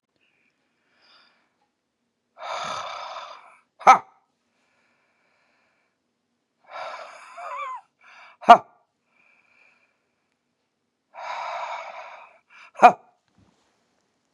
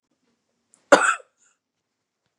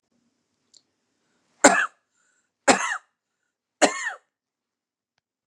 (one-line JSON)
{"exhalation_length": "14.3 s", "exhalation_amplitude": 32768, "exhalation_signal_mean_std_ratio": 0.18, "cough_length": "2.4 s", "cough_amplitude": 32767, "cough_signal_mean_std_ratio": 0.21, "three_cough_length": "5.5 s", "three_cough_amplitude": 32366, "three_cough_signal_mean_std_ratio": 0.23, "survey_phase": "beta (2021-08-13 to 2022-03-07)", "age": "45-64", "gender": "Female", "wearing_mask": "No", "symptom_none": true, "smoker_status": "Ex-smoker", "respiratory_condition_asthma": false, "respiratory_condition_other": false, "recruitment_source": "REACT", "submission_delay": "10 days", "covid_test_result": "Negative", "covid_test_method": "RT-qPCR", "influenza_a_test_result": "Negative", "influenza_b_test_result": "Negative"}